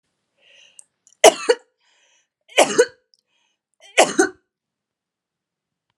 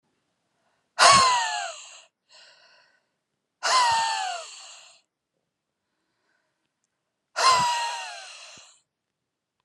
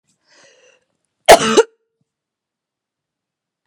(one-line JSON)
{"three_cough_length": "6.0 s", "three_cough_amplitude": 32768, "three_cough_signal_mean_std_ratio": 0.23, "exhalation_length": "9.6 s", "exhalation_amplitude": 29930, "exhalation_signal_mean_std_ratio": 0.37, "cough_length": "3.7 s", "cough_amplitude": 32768, "cough_signal_mean_std_ratio": 0.21, "survey_phase": "alpha (2021-03-01 to 2021-08-12)", "age": "45-64", "gender": "Female", "wearing_mask": "No", "symptom_none": true, "smoker_status": "Ex-smoker", "respiratory_condition_asthma": false, "respiratory_condition_other": false, "recruitment_source": "REACT", "submission_delay": "1 day", "covid_test_result": "Negative", "covid_test_method": "RT-qPCR"}